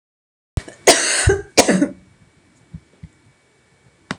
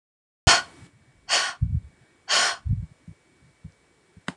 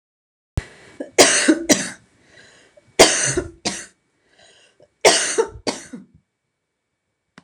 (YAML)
cough_length: 4.2 s
cough_amplitude: 26028
cough_signal_mean_std_ratio: 0.35
exhalation_length: 4.4 s
exhalation_amplitude: 22560
exhalation_signal_mean_std_ratio: 0.37
three_cough_length: 7.4 s
three_cough_amplitude: 26028
three_cough_signal_mean_std_ratio: 0.34
survey_phase: alpha (2021-03-01 to 2021-08-12)
age: 45-64
gender: Female
wearing_mask: 'No'
symptom_none: true
smoker_status: Never smoked
respiratory_condition_asthma: false
respiratory_condition_other: false
recruitment_source: REACT
submission_delay: 1 day
covid_test_result: Negative
covid_test_method: RT-qPCR